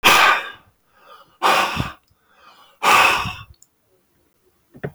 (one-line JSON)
{"exhalation_length": "4.9 s", "exhalation_amplitude": 32766, "exhalation_signal_mean_std_ratio": 0.42, "survey_phase": "beta (2021-08-13 to 2022-03-07)", "age": "65+", "gender": "Male", "wearing_mask": "No", "symptom_sore_throat": true, "smoker_status": "Never smoked", "respiratory_condition_asthma": false, "respiratory_condition_other": false, "recruitment_source": "REACT", "submission_delay": "2 days", "covid_test_result": "Negative", "covid_test_method": "RT-qPCR", "influenza_a_test_result": "Unknown/Void", "influenza_b_test_result": "Unknown/Void"}